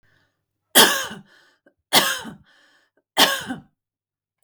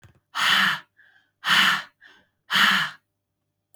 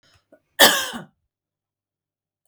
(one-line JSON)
{"three_cough_length": "4.4 s", "three_cough_amplitude": 32768, "three_cough_signal_mean_std_ratio": 0.31, "exhalation_length": "3.8 s", "exhalation_amplitude": 16520, "exhalation_signal_mean_std_ratio": 0.47, "cough_length": "2.5 s", "cough_amplitude": 32768, "cough_signal_mean_std_ratio": 0.24, "survey_phase": "beta (2021-08-13 to 2022-03-07)", "age": "45-64", "gender": "Female", "wearing_mask": "No", "symptom_none": true, "smoker_status": "Never smoked", "respiratory_condition_asthma": false, "respiratory_condition_other": false, "recruitment_source": "REACT", "submission_delay": "2 days", "covid_test_result": "Negative", "covid_test_method": "RT-qPCR", "influenza_a_test_result": "Negative", "influenza_b_test_result": "Negative"}